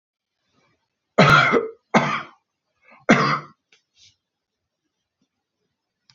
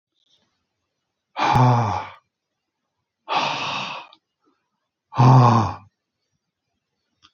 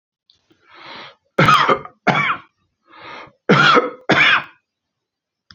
{
  "three_cough_length": "6.1 s",
  "three_cough_amplitude": 28118,
  "three_cough_signal_mean_std_ratio": 0.31,
  "exhalation_length": "7.3 s",
  "exhalation_amplitude": 25410,
  "exhalation_signal_mean_std_ratio": 0.37,
  "cough_length": "5.5 s",
  "cough_amplitude": 29107,
  "cough_signal_mean_std_ratio": 0.43,
  "survey_phase": "beta (2021-08-13 to 2022-03-07)",
  "age": "65+",
  "gender": "Male",
  "wearing_mask": "No",
  "symptom_none": true,
  "smoker_status": "Ex-smoker",
  "respiratory_condition_asthma": false,
  "respiratory_condition_other": false,
  "recruitment_source": "REACT",
  "submission_delay": "2 days",
  "covid_test_result": "Negative",
  "covid_test_method": "RT-qPCR"
}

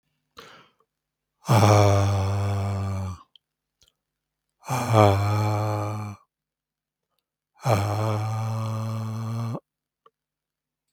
{
  "exhalation_length": "10.9 s",
  "exhalation_amplitude": 28552,
  "exhalation_signal_mean_std_ratio": 0.54,
  "survey_phase": "beta (2021-08-13 to 2022-03-07)",
  "age": "45-64",
  "gender": "Male",
  "wearing_mask": "No",
  "symptom_none": true,
  "symptom_onset": "5 days",
  "smoker_status": "Ex-smoker",
  "respiratory_condition_asthma": true,
  "respiratory_condition_other": false,
  "recruitment_source": "REACT",
  "submission_delay": "2 days",
  "covid_test_result": "Positive",
  "covid_test_method": "RT-qPCR",
  "covid_ct_value": 20.7,
  "covid_ct_gene": "E gene",
  "influenza_a_test_result": "Negative",
  "influenza_b_test_result": "Negative"
}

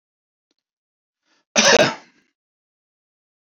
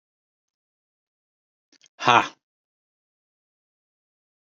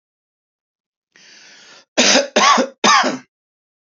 {
  "cough_length": "3.4 s",
  "cough_amplitude": 29989,
  "cough_signal_mean_std_ratio": 0.25,
  "exhalation_length": "4.4 s",
  "exhalation_amplitude": 28153,
  "exhalation_signal_mean_std_ratio": 0.15,
  "three_cough_length": "3.9 s",
  "three_cough_amplitude": 31236,
  "three_cough_signal_mean_std_ratio": 0.4,
  "survey_phase": "beta (2021-08-13 to 2022-03-07)",
  "age": "65+",
  "gender": "Male",
  "wearing_mask": "No",
  "symptom_none": true,
  "smoker_status": "Never smoked",
  "respiratory_condition_asthma": false,
  "respiratory_condition_other": false,
  "recruitment_source": "REACT",
  "submission_delay": "1 day",
  "covid_test_result": "Negative",
  "covid_test_method": "RT-qPCR",
  "influenza_a_test_result": "Negative",
  "influenza_b_test_result": "Negative"
}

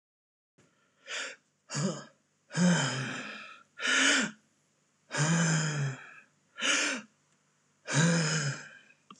{
  "exhalation_length": "9.2 s",
  "exhalation_amplitude": 7117,
  "exhalation_signal_mean_std_ratio": 0.55,
  "survey_phase": "alpha (2021-03-01 to 2021-08-12)",
  "age": "18-44",
  "gender": "Male",
  "wearing_mask": "No",
  "symptom_none": true,
  "smoker_status": "Never smoked",
  "respiratory_condition_asthma": false,
  "respiratory_condition_other": false,
  "recruitment_source": "REACT",
  "submission_delay": "3 days",
  "covid_test_result": "Negative",
  "covid_test_method": "RT-qPCR"
}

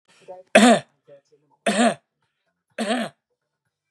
{
  "three_cough_length": "3.9 s",
  "three_cough_amplitude": 32502,
  "three_cough_signal_mean_std_ratio": 0.34,
  "survey_phase": "beta (2021-08-13 to 2022-03-07)",
  "age": "65+",
  "gender": "Male",
  "wearing_mask": "No",
  "symptom_none": true,
  "smoker_status": "Ex-smoker",
  "respiratory_condition_asthma": false,
  "respiratory_condition_other": false,
  "recruitment_source": "REACT",
  "submission_delay": "-1 day",
  "covid_test_result": "Negative",
  "covid_test_method": "RT-qPCR",
  "influenza_a_test_result": "Negative",
  "influenza_b_test_result": "Negative"
}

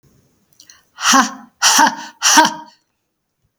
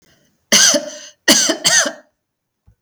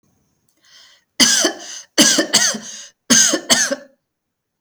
{
  "exhalation_length": "3.6 s",
  "exhalation_amplitude": 32768,
  "exhalation_signal_mean_std_ratio": 0.42,
  "cough_length": "2.8 s",
  "cough_amplitude": 32768,
  "cough_signal_mean_std_ratio": 0.46,
  "three_cough_length": "4.6 s",
  "three_cough_amplitude": 32768,
  "three_cough_signal_mean_std_ratio": 0.46,
  "survey_phase": "beta (2021-08-13 to 2022-03-07)",
  "age": "45-64",
  "gender": "Female",
  "wearing_mask": "No",
  "symptom_shortness_of_breath": true,
  "symptom_fatigue": true,
  "symptom_headache": true,
  "symptom_onset": "11 days",
  "smoker_status": "Never smoked",
  "respiratory_condition_asthma": false,
  "respiratory_condition_other": false,
  "recruitment_source": "REACT",
  "submission_delay": "1 day",
  "covid_test_result": "Negative",
  "covid_test_method": "RT-qPCR",
  "influenza_a_test_result": "Negative",
  "influenza_b_test_result": "Negative"
}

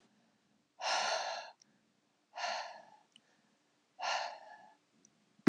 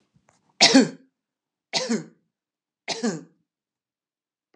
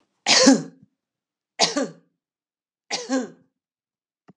{
  "exhalation_length": "5.5 s",
  "exhalation_amplitude": 9340,
  "exhalation_signal_mean_std_ratio": 0.36,
  "three_cough_length": "4.6 s",
  "three_cough_amplitude": 28727,
  "three_cough_signal_mean_std_ratio": 0.27,
  "cough_length": "4.4 s",
  "cough_amplitude": 26817,
  "cough_signal_mean_std_ratio": 0.32,
  "survey_phase": "alpha (2021-03-01 to 2021-08-12)",
  "age": "45-64",
  "gender": "Female",
  "wearing_mask": "No",
  "symptom_none": true,
  "smoker_status": "Never smoked",
  "respiratory_condition_asthma": false,
  "respiratory_condition_other": false,
  "recruitment_source": "REACT",
  "submission_delay": "2 days",
  "covid_test_result": "Negative",
  "covid_test_method": "RT-qPCR"
}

